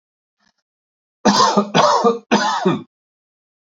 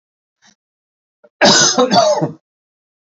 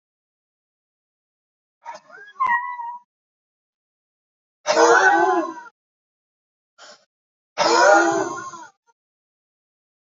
{"three_cough_length": "3.8 s", "three_cough_amplitude": 29567, "three_cough_signal_mean_std_ratio": 0.49, "cough_length": "3.2 s", "cough_amplitude": 32767, "cough_signal_mean_std_ratio": 0.43, "exhalation_length": "10.2 s", "exhalation_amplitude": 26334, "exhalation_signal_mean_std_ratio": 0.36, "survey_phase": "beta (2021-08-13 to 2022-03-07)", "age": "45-64", "gender": "Male", "wearing_mask": "No", "symptom_none": true, "smoker_status": "Never smoked", "respiratory_condition_asthma": false, "respiratory_condition_other": false, "recruitment_source": "REACT", "submission_delay": "1 day", "covid_test_result": "Positive", "covid_test_method": "RT-qPCR", "covid_ct_value": 18.6, "covid_ct_gene": "E gene", "influenza_a_test_result": "Negative", "influenza_b_test_result": "Negative"}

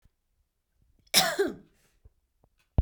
{"cough_length": "2.8 s", "cough_amplitude": 20602, "cough_signal_mean_std_ratio": 0.28, "survey_phase": "beta (2021-08-13 to 2022-03-07)", "age": "18-44", "gender": "Female", "wearing_mask": "No", "symptom_runny_or_blocked_nose": true, "smoker_status": "Never smoked", "respiratory_condition_asthma": false, "respiratory_condition_other": false, "recruitment_source": "Test and Trace", "submission_delay": "2 days", "covid_test_result": "Negative", "covid_test_method": "RT-qPCR"}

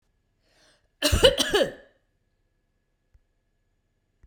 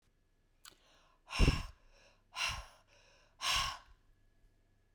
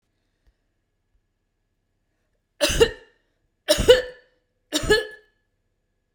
{"cough_length": "4.3 s", "cough_amplitude": 26805, "cough_signal_mean_std_ratio": 0.27, "exhalation_length": "4.9 s", "exhalation_amplitude": 5432, "exhalation_signal_mean_std_ratio": 0.32, "three_cough_length": "6.1 s", "three_cough_amplitude": 32768, "three_cough_signal_mean_std_ratio": 0.27, "survey_phase": "beta (2021-08-13 to 2022-03-07)", "age": "45-64", "gender": "Female", "wearing_mask": "No", "symptom_none": true, "smoker_status": "Ex-smoker", "respiratory_condition_asthma": false, "respiratory_condition_other": false, "recruitment_source": "REACT", "submission_delay": "2 days", "covid_test_result": "Negative", "covid_test_method": "RT-qPCR", "influenza_a_test_result": "Negative", "influenza_b_test_result": "Negative"}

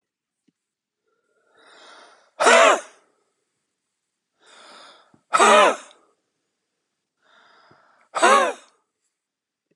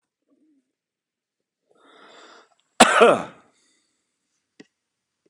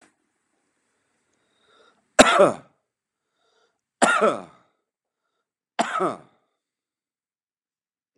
{"exhalation_length": "9.8 s", "exhalation_amplitude": 28872, "exhalation_signal_mean_std_ratio": 0.28, "cough_length": "5.3 s", "cough_amplitude": 32768, "cough_signal_mean_std_ratio": 0.21, "three_cough_length": "8.2 s", "three_cough_amplitude": 32768, "three_cough_signal_mean_std_ratio": 0.24, "survey_phase": "beta (2021-08-13 to 2022-03-07)", "age": "45-64", "gender": "Male", "wearing_mask": "No", "symptom_sore_throat": true, "symptom_diarrhoea": true, "symptom_headache": true, "symptom_other": true, "symptom_onset": "3 days", "smoker_status": "Ex-smoker", "respiratory_condition_asthma": true, "respiratory_condition_other": false, "recruitment_source": "Test and Trace", "submission_delay": "2 days", "covid_test_result": "Positive", "covid_test_method": "RT-qPCR", "covid_ct_value": 18.4, "covid_ct_gene": "N gene", "covid_ct_mean": 19.1, "covid_viral_load": "540000 copies/ml", "covid_viral_load_category": "Low viral load (10K-1M copies/ml)"}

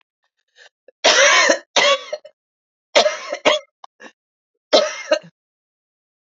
{"three_cough_length": "6.2 s", "three_cough_amplitude": 31855, "three_cough_signal_mean_std_ratio": 0.39, "survey_phase": "beta (2021-08-13 to 2022-03-07)", "age": "45-64", "gender": "Female", "wearing_mask": "No", "symptom_cough_any": true, "symptom_runny_or_blocked_nose": true, "symptom_sore_throat": true, "symptom_fatigue": true, "symptom_fever_high_temperature": true, "symptom_headache": true, "symptom_onset": "2 days", "smoker_status": "Never smoked", "respiratory_condition_asthma": false, "respiratory_condition_other": false, "recruitment_source": "Test and Trace", "submission_delay": "1 day", "covid_test_result": "Positive", "covid_test_method": "RT-qPCR", "covid_ct_value": 19.9, "covid_ct_gene": "ORF1ab gene", "covid_ct_mean": 20.4, "covid_viral_load": "200000 copies/ml", "covid_viral_load_category": "Low viral load (10K-1M copies/ml)"}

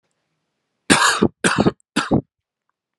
{"three_cough_length": "3.0 s", "three_cough_amplitude": 32768, "three_cough_signal_mean_std_ratio": 0.4, "survey_phase": "alpha (2021-03-01 to 2021-08-12)", "age": "18-44", "gender": "Male", "wearing_mask": "No", "symptom_fatigue": true, "symptom_headache": true, "smoker_status": "Current smoker (e-cigarettes or vapes only)", "respiratory_condition_asthma": false, "respiratory_condition_other": false, "recruitment_source": "Test and Trace", "submission_delay": "2 days", "covid_test_result": "Positive", "covid_test_method": "RT-qPCR", "covid_ct_value": 17.7, "covid_ct_gene": "ORF1ab gene"}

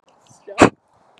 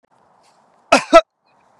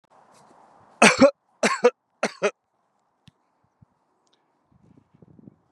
{"exhalation_length": "1.2 s", "exhalation_amplitude": 32768, "exhalation_signal_mean_std_ratio": 0.23, "cough_length": "1.8 s", "cough_amplitude": 32768, "cough_signal_mean_std_ratio": 0.24, "three_cough_length": "5.7 s", "three_cough_amplitude": 30753, "three_cough_signal_mean_std_ratio": 0.23, "survey_phase": "beta (2021-08-13 to 2022-03-07)", "age": "18-44", "gender": "Male", "wearing_mask": "No", "symptom_none": true, "smoker_status": "Ex-smoker", "respiratory_condition_asthma": false, "respiratory_condition_other": false, "recruitment_source": "REACT", "submission_delay": "1 day", "covid_test_result": "Negative", "covid_test_method": "RT-qPCR"}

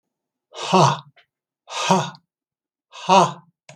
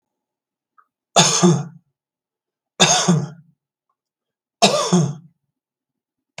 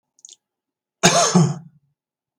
{"exhalation_length": "3.8 s", "exhalation_amplitude": 31703, "exhalation_signal_mean_std_ratio": 0.37, "three_cough_length": "6.4 s", "three_cough_amplitude": 32768, "three_cough_signal_mean_std_ratio": 0.37, "cough_length": "2.4 s", "cough_amplitude": 32766, "cough_signal_mean_std_ratio": 0.37, "survey_phase": "beta (2021-08-13 to 2022-03-07)", "age": "65+", "gender": "Male", "wearing_mask": "No", "symptom_none": true, "smoker_status": "Never smoked", "respiratory_condition_asthma": false, "respiratory_condition_other": false, "recruitment_source": "REACT", "submission_delay": "0 days", "covid_test_result": "Negative", "covid_test_method": "RT-qPCR", "influenza_a_test_result": "Negative", "influenza_b_test_result": "Negative"}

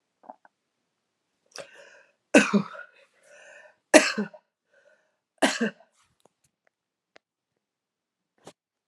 {"three_cough_length": "8.9 s", "three_cough_amplitude": 30637, "three_cough_signal_mean_std_ratio": 0.2, "survey_phase": "beta (2021-08-13 to 2022-03-07)", "age": "45-64", "gender": "Female", "wearing_mask": "No", "symptom_cough_any": true, "symptom_runny_or_blocked_nose": true, "symptom_shortness_of_breath": true, "symptom_fatigue": true, "symptom_onset": "6 days", "smoker_status": "Never smoked", "respiratory_condition_asthma": false, "respiratory_condition_other": false, "recruitment_source": "Test and Trace", "submission_delay": "2 days", "covid_test_result": "Positive", "covid_test_method": "RT-qPCR"}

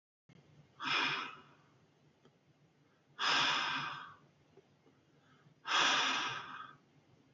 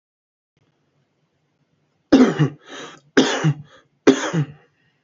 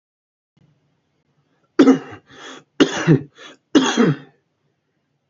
{"exhalation_length": "7.3 s", "exhalation_amplitude": 5060, "exhalation_signal_mean_std_ratio": 0.46, "cough_length": "5.0 s", "cough_amplitude": 28343, "cough_signal_mean_std_ratio": 0.34, "three_cough_length": "5.3 s", "three_cough_amplitude": 30112, "three_cough_signal_mean_std_ratio": 0.32, "survey_phase": "alpha (2021-03-01 to 2021-08-12)", "age": "18-44", "gender": "Male", "wearing_mask": "No", "symptom_none": true, "smoker_status": "Current smoker (11 or more cigarettes per day)", "respiratory_condition_asthma": false, "respiratory_condition_other": false, "recruitment_source": "REACT", "submission_delay": "1 day", "covid_test_result": "Negative", "covid_test_method": "RT-qPCR"}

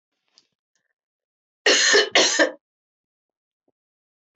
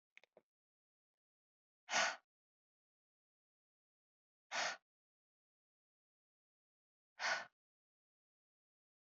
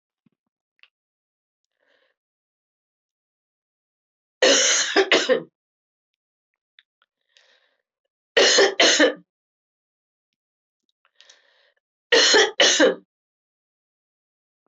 {"cough_length": "4.4 s", "cough_amplitude": 20506, "cough_signal_mean_std_ratio": 0.33, "exhalation_length": "9.0 s", "exhalation_amplitude": 2087, "exhalation_signal_mean_std_ratio": 0.21, "three_cough_length": "14.7 s", "three_cough_amplitude": 22718, "three_cough_signal_mean_std_ratio": 0.31, "survey_phase": "alpha (2021-03-01 to 2021-08-12)", "age": "65+", "gender": "Female", "wearing_mask": "No", "symptom_cough_any": true, "symptom_fatigue": true, "symptom_headache": true, "smoker_status": "Never smoked", "respiratory_condition_asthma": false, "respiratory_condition_other": false, "recruitment_source": "Test and Trace", "submission_delay": "1 day", "covid_test_result": "Positive", "covid_test_method": "RT-qPCR", "covid_ct_value": 14.7, "covid_ct_gene": "ORF1ab gene", "covid_ct_mean": 15.0, "covid_viral_load": "12000000 copies/ml", "covid_viral_load_category": "High viral load (>1M copies/ml)"}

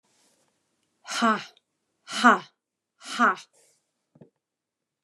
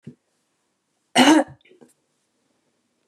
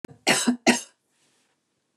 {"exhalation_length": "5.0 s", "exhalation_amplitude": 19436, "exhalation_signal_mean_std_ratio": 0.27, "cough_length": "3.1 s", "cough_amplitude": 27151, "cough_signal_mean_std_ratio": 0.25, "three_cough_length": "2.0 s", "three_cough_amplitude": 17400, "three_cough_signal_mean_std_ratio": 0.35, "survey_phase": "beta (2021-08-13 to 2022-03-07)", "age": "45-64", "gender": "Female", "wearing_mask": "No", "symptom_none": true, "smoker_status": "Never smoked", "respiratory_condition_asthma": false, "respiratory_condition_other": false, "recruitment_source": "REACT", "submission_delay": "1 day", "covid_test_result": "Negative", "covid_test_method": "RT-qPCR", "influenza_a_test_result": "Negative", "influenza_b_test_result": "Negative"}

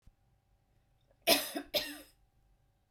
{"cough_length": "2.9 s", "cough_amplitude": 7317, "cough_signal_mean_std_ratio": 0.29, "survey_phase": "beta (2021-08-13 to 2022-03-07)", "age": "45-64", "gender": "Female", "wearing_mask": "No", "symptom_none": true, "symptom_onset": "7 days", "smoker_status": "Ex-smoker", "respiratory_condition_asthma": false, "respiratory_condition_other": false, "recruitment_source": "REACT", "submission_delay": "2 days", "covid_test_result": "Negative", "covid_test_method": "RT-qPCR", "influenza_a_test_result": "Negative", "influenza_b_test_result": "Negative"}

